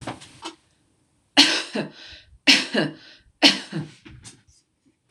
{"three_cough_length": "5.1 s", "three_cough_amplitude": 26028, "three_cough_signal_mean_std_ratio": 0.34, "survey_phase": "beta (2021-08-13 to 2022-03-07)", "age": "45-64", "gender": "Female", "wearing_mask": "No", "symptom_runny_or_blocked_nose": true, "smoker_status": "Never smoked", "respiratory_condition_asthma": false, "respiratory_condition_other": false, "recruitment_source": "REACT", "submission_delay": "1 day", "covid_test_result": "Negative", "covid_test_method": "RT-qPCR", "influenza_a_test_result": "Negative", "influenza_b_test_result": "Negative"}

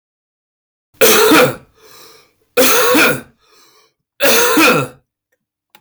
{"three_cough_length": "5.8 s", "three_cough_amplitude": 32768, "three_cough_signal_mean_std_ratio": 0.53, "survey_phase": "beta (2021-08-13 to 2022-03-07)", "age": "45-64", "gender": "Male", "wearing_mask": "No", "symptom_none": true, "smoker_status": "Never smoked", "respiratory_condition_asthma": false, "respiratory_condition_other": false, "recruitment_source": "REACT", "submission_delay": "2 days", "covid_test_result": "Negative", "covid_test_method": "RT-qPCR", "influenza_a_test_result": "Negative", "influenza_b_test_result": "Negative"}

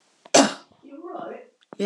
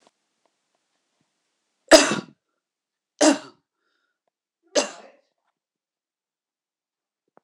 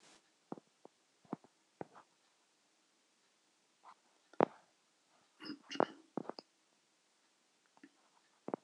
{"cough_length": "1.9 s", "cough_amplitude": 26026, "cough_signal_mean_std_ratio": 0.32, "three_cough_length": "7.4 s", "three_cough_amplitude": 26028, "three_cough_signal_mean_std_ratio": 0.18, "exhalation_length": "8.6 s", "exhalation_amplitude": 8851, "exhalation_signal_mean_std_ratio": 0.14, "survey_phase": "alpha (2021-03-01 to 2021-08-12)", "age": "65+", "gender": "Female", "wearing_mask": "No", "symptom_none": true, "smoker_status": "Never smoked", "respiratory_condition_asthma": false, "respiratory_condition_other": false, "recruitment_source": "REACT", "submission_delay": "2 days", "covid_test_result": "Negative", "covid_test_method": "RT-qPCR"}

